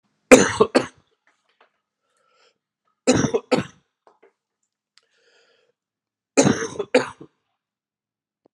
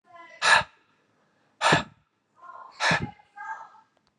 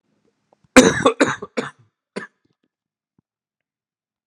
three_cough_length: 8.5 s
three_cough_amplitude: 32768
three_cough_signal_mean_std_ratio: 0.25
exhalation_length: 4.2 s
exhalation_amplitude: 21265
exhalation_signal_mean_std_ratio: 0.35
cough_length: 4.3 s
cough_amplitude: 32768
cough_signal_mean_std_ratio: 0.24
survey_phase: alpha (2021-03-01 to 2021-08-12)
age: 45-64
gender: Male
wearing_mask: 'No'
symptom_cough_any: true
symptom_new_continuous_cough: true
symptom_headache: true
symptom_onset: 5 days
smoker_status: Never smoked
respiratory_condition_asthma: false
respiratory_condition_other: false
recruitment_source: Test and Trace
submission_delay: 2 days
covid_test_result: Positive
covid_test_method: RT-qPCR
covid_ct_value: 14.7
covid_ct_gene: ORF1ab gene
covid_ct_mean: 15.2
covid_viral_load: 10000000 copies/ml
covid_viral_load_category: High viral load (>1M copies/ml)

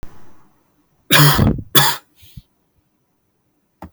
cough_length: 3.9 s
cough_amplitude: 32768
cough_signal_mean_std_ratio: 0.36
survey_phase: alpha (2021-03-01 to 2021-08-12)
age: 18-44
gender: Male
wearing_mask: 'No'
symptom_none: true
smoker_status: Never smoked
respiratory_condition_asthma: false
respiratory_condition_other: false
recruitment_source: REACT
submission_delay: 1 day
covid_test_result: Negative
covid_test_method: RT-qPCR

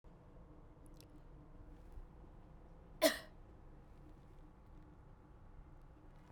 cough_length: 6.3 s
cough_amplitude: 4400
cough_signal_mean_std_ratio: 0.37
survey_phase: beta (2021-08-13 to 2022-03-07)
age: 45-64
gender: Female
wearing_mask: 'No'
symptom_runny_or_blocked_nose: true
symptom_fever_high_temperature: true
symptom_other: true
symptom_onset: 3 days
smoker_status: Never smoked
respiratory_condition_asthma: false
respiratory_condition_other: false
recruitment_source: Test and Trace
submission_delay: 1 day
covid_test_result: Positive
covid_test_method: RT-qPCR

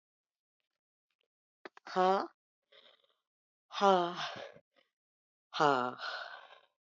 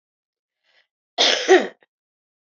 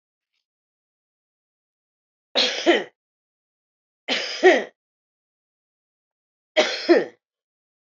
exhalation_length: 6.8 s
exhalation_amplitude: 6960
exhalation_signal_mean_std_ratio: 0.3
cough_length: 2.6 s
cough_amplitude: 25494
cough_signal_mean_std_ratio: 0.3
three_cough_length: 7.9 s
three_cough_amplitude: 24326
three_cough_signal_mean_std_ratio: 0.28
survey_phase: beta (2021-08-13 to 2022-03-07)
age: 45-64
gender: Female
wearing_mask: 'Yes'
symptom_new_continuous_cough: true
symptom_runny_or_blocked_nose: true
symptom_sore_throat: true
symptom_fatigue: true
symptom_fever_high_temperature: true
symptom_headache: true
symptom_onset: 2 days
smoker_status: Never smoked
respiratory_condition_asthma: false
respiratory_condition_other: false
recruitment_source: Test and Trace
submission_delay: 2 days
covid_test_result: Positive
covid_test_method: RT-qPCR
covid_ct_value: 25.1
covid_ct_gene: ORF1ab gene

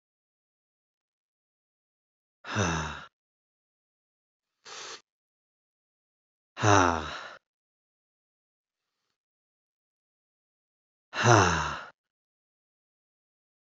exhalation_length: 13.7 s
exhalation_amplitude: 24542
exhalation_signal_mean_std_ratio: 0.24
survey_phase: beta (2021-08-13 to 2022-03-07)
age: 45-64
gender: Male
wearing_mask: 'No'
symptom_cough_any: true
symptom_runny_or_blocked_nose: true
symptom_fatigue: true
symptom_fever_high_temperature: true
symptom_onset: 3 days
smoker_status: Never smoked
respiratory_condition_asthma: true
respiratory_condition_other: false
recruitment_source: Test and Trace
submission_delay: 1 day
covid_test_result: Positive
covid_test_method: RT-qPCR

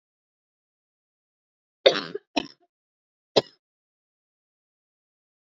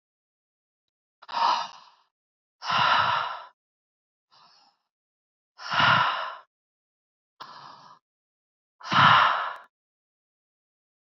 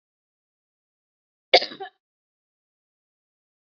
three_cough_length: 5.5 s
three_cough_amplitude: 27055
three_cough_signal_mean_std_ratio: 0.14
exhalation_length: 11.0 s
exhalation_amplitude: 19093
exhalation_signal_mean_std_ratio: 0.36
cough_length: 3.8 s
cough_amplitude: 29697
cough_signal_mean_std_ratio: 0.12
survey_phase: beta (2021-08-13 to 2022-03-07)
age: 18-44
gender: Female
wearing_mask: 'No'
symptom_cough_any: true
symptom_runny_or_blocked_nose: true
symptom_fatigue: true
symptom_headache: true
symptom_onset: 3 days
smoker_status: Ex-smoker
respiratory_condition_asthma: false
respiratory_condition_other: false
recruitment_source: Test and Trace
submission_delay: 1 day
covid_test_result: Positive
covid_test_method: RT-qPCR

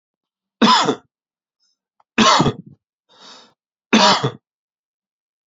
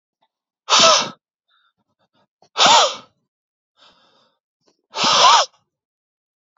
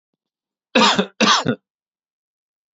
three_cough_length: 5.5 s
three_cough_amplitude: 30532
three_cough_signal_mean_std_ratio: 0.35
exhalation_length: 6.6 s
exhalation_amplitude: 31845
exhalation_signal_mean_std_ratio: 0.35
cough_length: 2.7 s
cough_amplitude: 30266
cough_signal_mean_std_ratio: 0.37
survey_phase: beta (2021-08-13 to 2022-03-07)
age: 18-44
gender: Male
wearing_mask: 'No'
symptom_none: true
symptom_onset: 6 days
smoker_status: Current smoker (e-cigarettes or vapes only)
respiratory_condition_asthma: false
respiratory_condition_other: false
recruitment_source: Test and Trace
submission_delay: 2 days
covid_test_result: Negative
covid_test_method: RT-qPCR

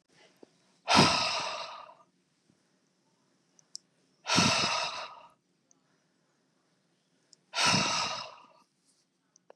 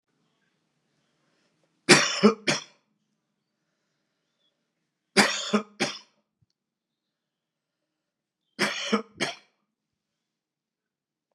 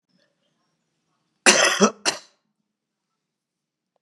exhalation_length: 9.6 s
exhalation_amplitude: 18268
exhalation_signal_mean_std_ratio: 0.37
three_cough_length: 11.3 s
three_cough_amplitude: 29832
three_cough_signal_mean_std_ratio: 0.24
cough_length: 4.0 s
cough_amplitude: 31946
cough_signal_mean_std_ratio: 0.26
survey_phase: beta (2021-08-13 to 2022-03-07)
age: 45-64
gender: Male
wearing_mask: 'No'
symptom_cough_any: true
symptom_runny_or_blocked_nose: true
symptom_onset: 3 days
smoker_status: Never smoked
respiratory_condition_asthma: false
respiratory_condition_other: false
recruitment_source: Test and Trace
submission_delay: 1 day
covid_test_result: Positive
covid_test_method: RT-qPCR
covid_ct_value: 20.9
covid_ct_gene: N gene
covid_ct_mean: 21.0
covid_viral_load: 130000 copies/ml
covid_viral_load_category: Low viral load (10K-1M copies/ml)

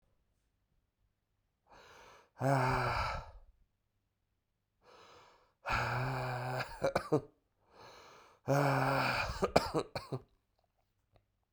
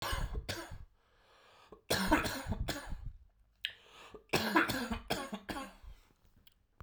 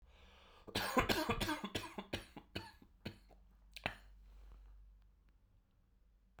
exhalation_length: 11.5 s
exhalation_amplitude: 11729
exhalation_signal_mean_std_ratio: 0.45
three_cough_length: 6.8 s
three_cough_amplitude: 7447
three_cough_signal_mean_std_ratio: 0.51
cough_length: 6.4 s
cough_amplitude: 5018
cough_signal_mean_std_ratio: 0.41
survey_phase: beta (2021-08-13 to 2022-03-07)
age: 18-44
gender: Male
wearing_mask: 'No'
symptom_runny_or_blocked_nose: true
symptom_fever_high_temperature: true
symptom_headache: true
symptom_onset: 2 days
smoker_status: Never smoked
respiratory_condition_asthma: false
respiratory_condition_other: false
recruitment_source: Test and Trace
submission_delay: 1 day
covid_test_result: Positive
covid_test_method: RT-qPCR
covid_ct_value: 19.2
covid_ct_gene: ORF1ab gene
covid_ct_mean: 19.7
covid_viral_load: 340000 copies/ml
covid_viral_load_category: Low viral load (10K-1M copies/ml)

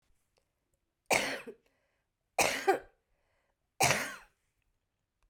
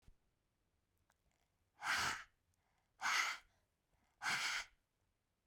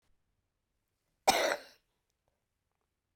three_cough_length: 5.3 s
three_cough_amplitude: 10203
three_cough_signal_mean_std_ratio: 0.31
exhalation_length: 5.5 s
exhalation_amplitude: 1805
exhalation_signal_mean_std_ratio: 0.38
cough_length: 3.2 s
cough_amplitude: 9574
cough_signal_mean_std_ratio: 0.23
survey_phase: beta (2021-08-13 to 2022-03-07)
age: 45-64
gender: Female
wearing_mask: 'No'
symptom_cough_any: true
symptom_runny_or_blocked_nose: true
symptom_headache: true
symptom_change_to_sense_of_smell_or_taste: true
symptom_loss_of_taste: true
symptom_onset: 6 days
smoker_status: Never smoked
respiratory_condition_asthma: false
respiratory_condition_other: false
recruitment_source: Test and Trace
submission_delay: 2 days
covid_test_result: Positive
covid_test_method: RT-qPCR
covid_ct_value: 20.0
covid_ct_gene: N gene
covid_ct_mean: 20.5
covid_viral_load: 190000 copies/ml
covid_viral_load_category: Low viral load (10K-1M copies/ml)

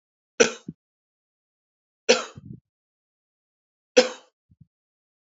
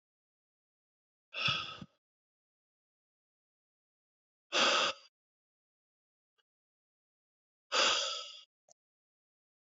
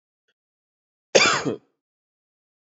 three_cough_length: 5.4 s
three_cough_amplitude: 26769
three_cough_signal_mean_std_ratio: 0.18
exhalation_length: 9.7 s
exhalation_amplitude: 5112
exhalation_signal_mean_std_ratio: 0.28
cough_length: 2.7 s
cough_amplitude: 29003
cough_signal_mean_std_ratio: 0.26
survey_phase: beta (2021-08-13 to 2022-03-07)
age: 45-64
gender: Male
wearing_mask: 'No'
symptom_runny_or_blocked_nose: true
symptom_fatigue: true
symptom_headache: true
symptom_change_to_sense_of_smell_or_taste: true
symptom_loss_of_taste: true
symptom_onset: 6 days
smoker_status: Never smoked
respiratory_condition_asthma: false
respiratory_condition_other: false
recruitment_source: Test and Trace
submission_delay: 2 days
covid_test_result: Positive
covid_test_method: RT-qPCR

